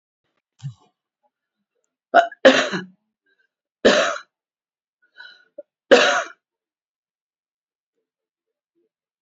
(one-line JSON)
{"three_cough_length": "9.2 s", "three_cough_amplitude": 32768, "three_cough_signal_mean_std_ratio": 0.25, "survey_phase": "beta (2021-08-13 to 2022-03-07)", "age": "65+", "gender": "Female", "wearing_mask": "No", "symptom_cough_any": true, "symptom_runny_or_blocked_nose": true, "symptom_fatigue": true, "symptom_headache": true, "symptom_onset": "2 days", "smoker_status": "Ex-smoker", "respiratory_condition_asthma": false, "respiratory_condition_other": false, "recruitment_source": "Test and Trace", "submission_delay": "1 day", "covid_test_result": "Positive", "covid_test_method": "ePCR"}